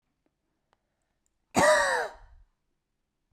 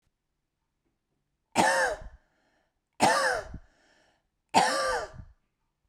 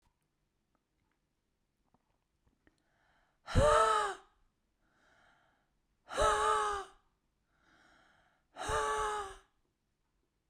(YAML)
cough_length: 3.3 s
cough_amplitude: 10282
cough_signal_mean_std_ratio: 0.32
three_cough_length: 5.9 s
three_cough_amplitude: 11973
three_cough_signal_mean_std_ratio: 0.39
exhalation_length: 10.5 s
exhalation_amplitude: 6458
exhalation_signal_mean_std_ratio: 0.35
survey_phase: beta (2021-08-13 to 2022-03-07)
age: 45-64
gender: Female
wearing_mask: 'No'
symptom_none: true
smoker_status: Ex-smoker
respiratory_condition_asthma: false
respiratory_condition_other: false
recruitment_source: REACT
submission_delay: 1 day
covid_test_result: Negative
covid_test_method: RT-qPCR